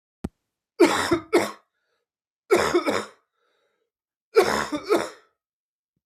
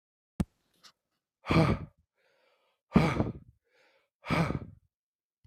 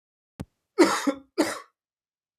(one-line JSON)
{"three_cough_length": "6.1 s", "three_cough_amplitude": 21452, "three_cough_signal_mean_std_ratio": 0.39, "exhalation_length": "5.5 s", "exhalation_amplitude": 11946, "exhalation_signal_mean_std_ratio": 0.33, "cough_length": "2.4 s", "cough_amplitude": 21032, "cough_signal_mean_std_ratio": 0.33, "survey_phase": "beta (2021-08-13 to 2022-03-07)", "age": "18-44", "gender": "Male", "wearing_mask": "No", "symptom_cough_any": true, "symptom_runny_or_blocked_nose": true, "symptom_sore_throat": true, "symptom_onset": "5 days", "smoker_status": "Never smoked", "respiratory_condition_asthma": false, "respiratory_condition_other": false, "recruitment_source": "REACT", "submission_delay": "1 day", "covid_test_result": "Negative", "covid_test_method": "RT-qPCR", "influenza_a_test_result": "Negative", "influenza_b_test_result": "Negative"}